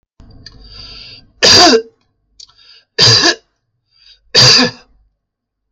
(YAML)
three_cough_length: 5.7 s
three_cough_amplitude: 32768
three_cough_signal_mean_std_ratio: 0.4
survey_phase: beta (2021-08-13 to 2022-03-07)
age: 45-64
gender: Male
wearing_mask: 'No'
symptom_none: true
smoker_status: Never smoked
respiratory_condition_asthma: false
respiratory_condition_other: false
recruitment_source: REACT
submission_delay: 2 days
covid_test_result: Negative
covid_test_method: RT-qPCR